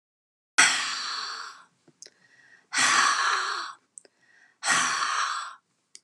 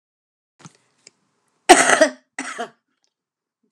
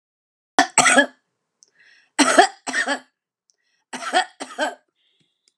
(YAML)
exhalation_length: 6.0 s
exhalation_amplitude: 19975
exhalation_signal_mean_std_ratio: 0.53
cough_length: 3.7 s
cough_amplitude: 32768
cough_signal_mean_std_ratio: 0.25
three_cough_length: 5.6 s
three_cough_amplitude: 32768
three_cough_signal_mean_std_ratio: 0.34
survey_phase: beta (2021-08-13 to 2022-03-07)
age: 45-64
gender: Female
wearing_mask: 'No'
symptom_none: true
symptom_onset: 12 days
smoker_status: Never smoked
respiratory_condition_asthma: false
respiratory_condition_other: false
recruitment_source: REACT
submission_delay: 1 day
covid_test_result: Negative
covid_test_method: RT-qPCR